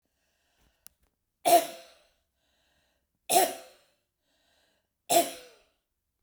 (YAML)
three_cough_length: 6.2 s
three_cough_amplitude: 12599
three_cough_signal_mean_std_ratio: 0.25
survey_phase: beta (2021-08-13 to 2022-03-07)
age: 65+
gender: Female
wearing_mask: 'No'
symptom_cough_any: true
symptom_runny_or_blocked_nose: true
smoker_status: Never smoked
respiratory_condition_asthma: false
respiratory_condition_other: false
recruitment_source: Test and Trace
submission_delay: 2 days
covid_test_result: Positive
covid_test_method: RT-qPCR
covid_ct_value: 20.5
covid_ct_gene: ORF1ab gene
covid_ct_mean: 21.1
covid_viral_load: 120000 copies/ml
covid_viral_load_category: Low viral load (10K-1M copies/ml)